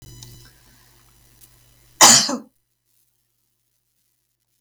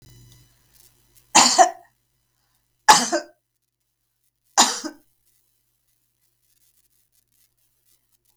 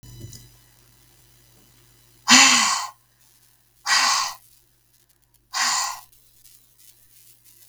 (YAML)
cough_length: 4.6 s
cough_amplitude: 32768
cough_signal_mean_std_ratio: 0.21
three_cough_length: 8.4 s
three_cough_amplitude: 32768
three_cough_signal_mean_std_ratio: 0.23
exhalation_length: 7.7 s
exhalation_amplitude: 32768
exhalation_signal_mean_std_ratio: 0.33
survey_phase: beta (2021-08-13 to 2022-03-07)
age: 45-64
gender: Female
wearing_mask: 'No'
symptom_none: true
smoker_status: Never smoked
respiratory_condition_asthma: false
respiratory_condition_other: false
recruitment_source: REACT
submission_delay: 3 days
covid_test_result: Negative
covid_test_method: RT-qPCR
influenza_a_test_result: Unknown/Void
influenza_b_test_result: Unknown/Void